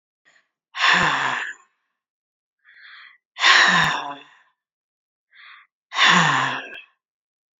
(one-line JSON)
{"exhalation_length": "7.6 s", "exhalation_amplitude": 28441, "exhalation_signal_mean_std_ratio": 0.42, "survey_phase": "beta (2021-08-13 to 2022-03-07)", "age": "45-64", "gender": "Female", "wearing_mask": "No", "symptom_runny_or_blocked_nose": true, "smoker_status": "Ex-smoker", "respiratory_condition_asthma": false, "respiratory_condition_other": false, "recruitment_source": "REACT", "submission_delay": "1 day", "covid_test_result": "Negative", "covid_test_method": "RT-qPCR"}